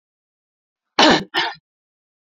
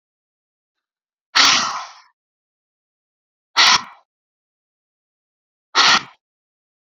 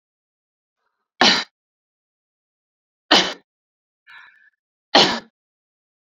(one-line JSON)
{"cough_length": "2.3 s", "cough_amplitude": 30889, "cough_signal_mean_std_ratio": 0.31, "exhalation_length": "7.0 s", "exhalation_amplitude": 32767, "exhalation_signal_mean_std_ratio": 0.28, "three_cough_length": "6.1 s", "three_cough_amplitude": 32768, "three_cough_signal_mean_std_ratio": 0.24, "survey_phase": "beta (2021-08-13 to 2022-03-07)", "age": "18-44", "gender": "Female", "wearing_mask": "No", "symptom_none": true, "smoker_status": "Never smoked", "respiratory_condition_asthma": false, "respiratory_condition_other": false, "recruitment_source": "REACT", "submission_delay": "1 day", "covid_test_result": "Negative", "covid_test_method": "RT-qPCR", "influenza_a_test_result": "Negative", "influenza_b_test_result": "Negative"}